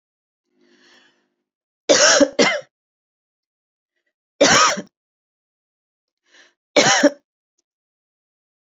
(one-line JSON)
{"three_cough_length": "8.8 s", "three_cough_amplitude": 32768, "three_cough_signal_mean_std_ratio": 0.3, "survey_phase": "beta (2021-08-13 to 2022-03-07)", "age": "45-64", "gender": "Female", "wearing_mask": "No", "symptom_cough_any": true, "symptom_runny_or_blocked_nose": true, "symptom_sore_throat": true, "symptom_fatigue": true, "symptom_onset": "26 days", "smoker_status": "Current smoker (e-cigarettes or vapes only)", "respiratory_condition_asthma": false, "respiratory_condition_other": false, "recruitment_source": "Test and Trace", "submission_delay": "2 days", "covid_test_result": "Negative", "covid_test_method": "RT-qPCR"}